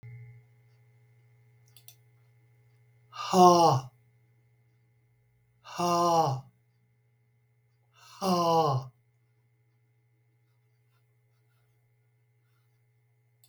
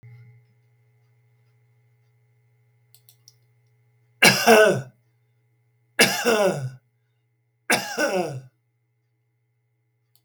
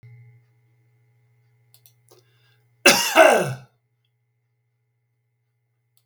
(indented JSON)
{
  "exhalation_length": "13.5 s",
  "exhalation_amplitude": 15615,
  "exhalation_signal_mean_std_ratio": 0.3,
  "three_cough_length": "10.2 s",
  "three_cough_amplitude": 32507,
  "three_cough_signal_mean_std_ratio": 0.31,
  "cough_length": "6.1 s",
  "cough_amplitude": 32768,
  "cough_signal_mean_std_ratio": 0.24,
  "survey_phase": "beta (2021-08-13 to 2022-03-07)",
  "age": "65+",
  "gender": "Male",
  "wearing_mask": "No",
  "symptom_none": true,
  "smoker_status": "Ex-smoker",
  "respiratory_condition_asthma": false,
  "respiratory_condition_other": false,
  "recruitment_source": "REACT",
  "submission_delay": "2 days",
  "covid_test_result": "Negative",
  "covid_test_method": "RT-qPCR"
}